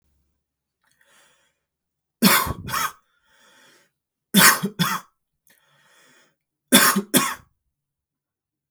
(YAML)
three_cough_length: 8.7 s
three_cough_amplitude: 32766
three_cough_signal_mean_std_ratio: 0.3
survey_phase: beta (2021-08-13 to 2022-03-07)
age: 18-44
gender: Male
wearing_mask: 'No'
symptom_none: true
smoker_status: Never smoked
respiratory_condition_asthma: false
respiratory_condition_other: false
recruitment_source: REACT
submission_delay: 1 day
covid_test_result: Negative
covid_test_method: RT-qPCR